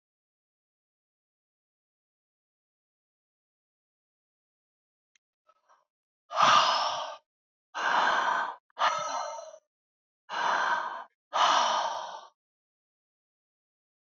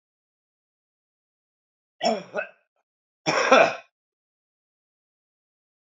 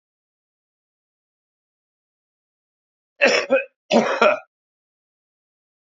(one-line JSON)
{"exhalation_length": "14.1 s", "exhalation_amplitude": 12280, "exhalation_signal_mean_std_ratio": 0.39, "three_cough_length": "5.9 s", "three_cough_amplitude": 27157, "three_cough_signal_mean_std_ratio": 0.25, "cough_length": "5.8 s", "cough_amplitude": 27695, "cough_signal_mean_std_ratio": 0.28, "survey_phase": "beta (2021-08-13 to 2022-03-07)", "age": "65+", "gender": "Male", "wearing_mask": "No", "symptom_cough_any": true, "symptom_runny_or_blocked_nose": true, "smoker_status": "Current smoker (1 to 10 cigarettes per day)", "respiratory_condition_asthma": false, "respiratory_condition_other": false, "recruitment_source": "REACT", "submission_delay": "32 days", "covid_test_result": "Negative", "covid_test_method": "RT-qPCR", "influenza_a_test_result": "Unknown/Void", "influenza_b_test_result": "Unknown/Void"}